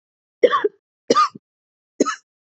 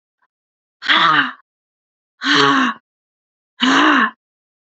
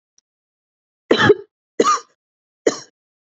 cough_length: 2.5 s
cough_amplitude: 27802
cough_signal_mean_std_ratio: 0.33
exhalation_length: 4.7 s
exhalation_amplitude: 27679
exhalation_signal_mean_std_ratio: 0.47
three_cough_length: 3.2 s
three_cough_amplitude: 29873
three_cough_signal_mean_std_ratio: 0.3
survey_phase: beta (2021-08-13 to 2022-03-07)
age: 18-44
gender: Female
wearing_mask: 'No'
symptom_new_continuous_cough: true
symptom_runny_or_blocked_nose: true
symptom_headache: true
symptom_change_to_sense_of_smell_or_taste: true
symptom_loss_of_taste: true
smoker_status: Never smoked
respiratory_condition_asthma: false
respiratory_condition_other: false
recruitment_source: Test and Trace
submission_delay: 2 days
covid_test_result: Positive
covid_test_method: RT-qPCR
covid_ct_value: 23.7
covid_ct_gene: ORF1ab gene
covid_ct_mean: 24.2
covid_viral_load: 12000 copies/ml
covid_viral_load_category: Low viral load (10K-1M copies/ml)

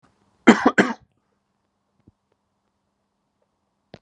cough_length: 4.0 s
cough_amplitude: 32768
cough_signal_mean_std_ratio: 0.19
survey_phase: beta (2021-08-13 to 2022-03-07)
age: 45-64
gender: Male
wearing_mask: 'No'
symptom_fever_high_temperature: true
smoker_status: Never smoked
respiratory_condition_asthma: false
respiratory_condition_other: false
recruitment_source: REACT
submission_delay: 10 days
covid_test_result: Negative
covid_test_method: RT-qPCR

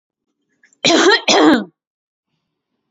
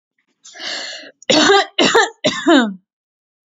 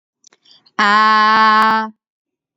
cough_length: 2.9 s
cough_amplitude: 32529
cough_signal_mean_std_ratio: 0.42
three_cough_length: 3.5 s
three_cough_amplitude: 29584
three_cough_signal_mean_std_ratio: 0.5
exhalation_length: 2.6 s
exhalation_amplitude: 29311
exhalation_signal_mean_std_ratio: 0.6
survey_phase: beta (2021-08-13 to 2022-03-07)
age: 18-44
gender: Female
wearing_mask: 'No'
symptom_none: true
smoker_status: Never smoked
respiratory_condition_asthma: false
respiratory_condition_other: false
recruitment_source: Test and Trace
submission_delay: 2 days
covid_test_result: Negative
covid_test_method: RT-qPCR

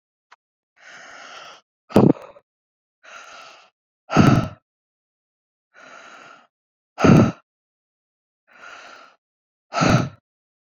exhalation_length: 10.7 s
exhalation_amplitude: 27607
exhalation_signal_mean_std_ratio: 0.27
survey_phase: beta (2021-08-13 to 2022-03-07)
age: 18-44
gender: Female
wearing_mask: 'No'
symptom_prefer_not_to_say: true
smoker_status: Ex-smoker
respiratory_condition_asthma: false
respiratory_condition_other: false
recruitment_source: REACT
submission_delay: 2 days
covid_test_result: Negative
covid_test_method: RT-qPCR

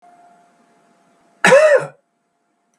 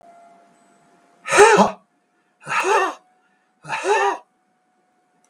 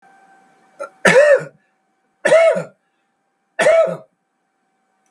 cough_length: 2.8 s
cough_amplitude: 32748
cough_signal_mean_std_ratio: 0.32
exhalation_length: 5.3 s
exhalation_amplitude: 32768
exhalation_signal_mean_std_ratio: 0.37
three_cough_length: 5.1 s
three_cough_amplitude: 32768
three_cough_signal_mean_std_ratio: 0.4
survey_phase: beta (2021-08-13 to 2022-03-07)
age: 65+
gender: Male
wearing_mask: 'No'
symptom_none: true
smoker_status: Ex-smoker
respiratory_condition_asthma: false
respiratory_condition_other: false
recruitment_source: REACT
submission_delay: 11 days
covid_test_result: Negative
covid_test_method: RT-qPCR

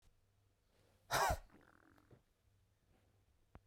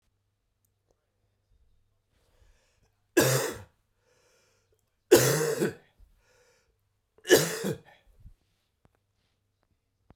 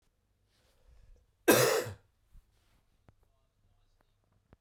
exhalation_length: 3.7 s
exhalation_amplitude: 2114
exhalation_signal_mean_std_ratio: 0.26
three_cough_length: 10.2 s
three_cough_amplitude: 18189
three_cough_signal_mean_std_ratio: 0.26
cough_length: 4.6 s
cough_amplitude: 9952
cough_signal_mean_std_ratio: 0.24
survey_phase: beta (2021-08-13 to 2022-03-07)
age: 45-64
gender: Male
wearing_mask: 'No'
symptom_cough_any: true
symptom_runny_or_blocked_nose: true
symptom_shortness_of_breath: true
symptom_abdominal_pain: true
symptom_fatigue: true
symptom_fever_high_temperature: true
symptom_headache: true
symptom_change_to_sense_of_smell_or_taste: true
symptom_onset: 4 days
smoker_status: Never smoked
respiratory_condition_asthma: false
respiratory_condition_other: false
recruitment_source: Test and Trace
submission_delay: 2 days
covid_test_result: Positive
covid_test_method: RT-qPCR
covid_ct_value: 14.6
covid_ct_gene: N gene
covid_ct_mean: 14.7
covid_viral_load: 15000000 copies/ml
covid_viral_load_category: High viral load (>1M copies/ml)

